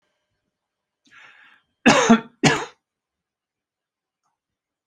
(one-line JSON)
{"cough_length": "4.9 s", "cough_amplitude": 29711, "cough_signal_mean_std_ratio": 0.25, "survey_phase": "beta (2021-08-13 to 2022-03-07)", "age": "65+", "gender": "Male", "wearing_mask": "No", "symptom_none": true, "smoker_status": "Never smoked", "respiratory_condition_asthma": false, "respiratory_condition_other": false, "recruitment_source": "REACT", "submission_delay": "1 day", "covid_test_result": "Negative", "covid_test_method": "RT-qPCR"}